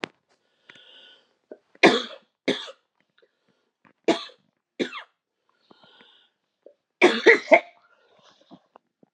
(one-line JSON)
{"three_cough_length": "9.1 s", "three_cough_amplitude": 32129, "three_cough_signal_mean_std_ratio": 0.23, "survey_phase": "beta (2021-08-13 to 2022-03-07)", "age": "18-44", "gender": "Female", "wearing_mask": "No", "symptom_cough_any": true, "symptom_runny_or_blocked_nose": true, "symptom_fatigue": true, "symptom_headache": true, "symptom_change_to_sense_of_smell_or_taste": true, "symptom_loss_of_taste": true, "smoker_status": "Never smoked", "respiratory_condition_asthma": false, "respiratory_condition_other": false, "recruitment_source": "Test and Trace", "submission_delay": "3 days", "covid_test_result": "Positive", "covid_test_method": "LFT"}